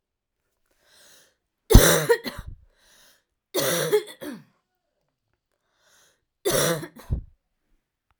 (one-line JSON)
{"three_cough_length": "8.2 s", "three_cough_amplitude": 32768, "three_cough_signal_mean_std_ratio": 0.29, "survey_phase": "alpha (2021-03-01 to 2021-08-12)", "age": "18-44", "gender": "Female", "wearing_mask": "No", "symptom_cough_any": true, "symptom_new_continuous_cough": true, "symptom_fatigue": true, "symptom_headache": true, "symptom_change_to_sense_of_smell_or_taste": true, "symptom_onset": "2 days", "smoker_status": "Never smoked", "respiratory_condition_asthma": false, "respiratory_condition_other": false, "recruitment_source": "Test and Trace", "submission_delay": "2 days", "covid_test_result": "Positive", "covid_test_method": "RT-qPCR", "covid_ct_value": 18.3, "covid_ct_gene": "ORF1ab gene", "covid_ct_mean": 19.4, "covid_viral_load": "430000 copies/ml", "covid_viral_load_category": "Low viral load (10K-1M copies/ml)"}